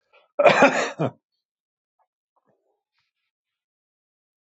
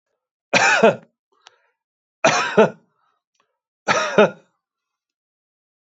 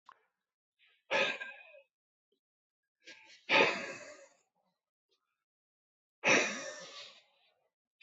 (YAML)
cough_length: 4.4 s
cough_amplitude: 25148
cough_signal_mean_std_ratio: 0.26
three_cough_length: 5.9 s
three_cough_amplitude: 25187
three_cough_signal_mean_std_ratio: 0.34
exhalation_length: 8.0 s
exhalation_amplitude: 6804
exhalation_signal_mean_std_ratio: 0.29
survey_phase: beta (2021-08-13 to 2022-03-07)
age: 65+
gender: Male
wearing_mask: 'No'
symptom_none: true
smoker_status: Ex-smoker
respiratory_condition_asthma: false
respiratory_condition_other: false
recruitment_source: REACT
submission_delay: 5 days
covid_test_result: Negative
covid_test_method: RT-qPCR
influenza_a_test_result: Negative
influenza_b_test_result: Negative